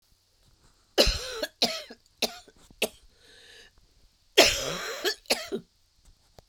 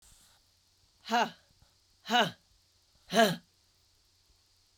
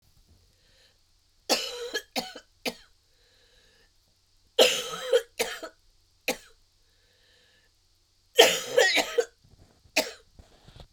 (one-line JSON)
{"cough_length": "6.5 s", "cough_amplitude": 24439, "cough_signal_mean_std_ratio": 0.34, "exhalation_length": "4.8 s", "exhalation_amplitude": 9265, "exhalation_signal_mean_std_ratio": 0.29, "three_cough_length": "10.9 s", "three_cough_amplitude": 32072, "three_cough_signal_mean_std_ratio": 0.31, "survey_phase": "beta (2021-08-13 to 2022-03-07)", "age": "45-64", "gender": "Female", "wearing_mask": "No", "symptom_cough_any": true, "symptom_runny_or_blocked_nose": true, "symptom_sore_throat": true, "symptom_fatigue": true, "symptom_headache": true, "symptom_other": true, "symptom_onset": "3 days", "smoker_status": "Never smoked", "respiratory_condition_asthma": false, "respiratory_condition_other": false, "recruitment_source": "Test and Trace", "submission_delay": "1 day", "covid_test_result": "Positive", "covid_test_method": "RT-qPCR", "covid_ct_value": 24.9, "covid_ct_gene": "ORF1ab gene"}